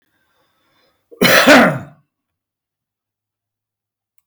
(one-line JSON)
{"cough_length": "4.3 s", "cough_amplitude": 32768, "cough_signal_mean_std_ratio": 0.3, "survey_phase": "beta (2021-08-13 to 2022-03-07)", "age": "65+", "gender": "Male", "wearing_mask": "No", "symptom_none": true, "smoker_status": "Never smoked", "respiratory_condition_asthma": false, "respiratory_condition_other": false, "recruitment_source": "REACT", "submission_delay": "5 days", "covid_test_result": "Negative", "covid_test_method": "RT-qPCR", "influenza_a_test_result": "Negative", "influenza_b_test_result": "Negative"}